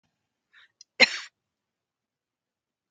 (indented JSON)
{
  "cough_length": "2.9 s",
  "cough_amplitude": 25733,
  "cough_signal_mean_std_ratio": 0.14,
  "survey_phase": "alpha (2021-03-01 to 2021-08-12)",
  "age": "65+",
  "gender": "Female",
  "wearing_mask": "No",
  "symptom_none": true,
  "smoker_status": "Prefer not to say",
  "respiratory_condition_asthma": false,
  "respiratory_condition_other": false,
  "recruitment_source": "REACT",
  "submission_delay": "3 days",
  "covid_test_result": "Negative",
  "covid_test_method": "RT-qPCR"
}